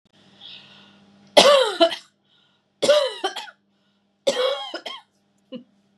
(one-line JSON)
{"three_cough_length": "6.0 s", "three_cough_amplitude": 32561, "three_cough_signal_mean_std_ratio": 0.36, "survey_phase": "beta (2021-08-13 to 2022-03-07)", "age": "45-64", "gender": "Female", "wearing_mask": "No", "symptom_none": true, "smoker_status": "Never smoked", "respiratory_condition_asthma": false, "respiratory_condition_other": false, "recruitment_source": "REACT", "submission_delay": "1 day", "covid_test_result": "Negative", "covid_test_method": "RT-qPCR", "influenza_a_test_result": "Negative", "influenza_b_test_result": "Negative"}